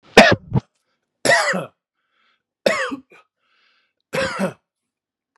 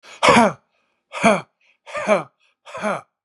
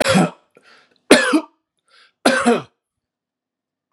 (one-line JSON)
{"cough_length": "5.4 s", "cough_amplitude": 32768, "cough_signal_mean_std_ratio": 0.33, "exhalation_length": "3.2 s", "exhalation_amplitude": 31120, "exhalation_signal_mean_std_ratio": 0.4, "three_cough_length": "3.9 s", "three_cough_amplitude": 32768, "three_cough_signal_mean_std_ratio": 0.37, "survey_phase": "beta (2021-08-13 to 2022-03-07)", "age": "45-64", "gender": "Male", "wearing_mask": "No", "symptom_none": true, "smoker_status": "Never smoked", "respiratory_condition_asthma": false, "respiratory_condition_other": false, "recruitment_source": "REACT", "submission_delay": "0 days", "covid_test_result": "Negative", "covid_test_method": "RT-qPCR"}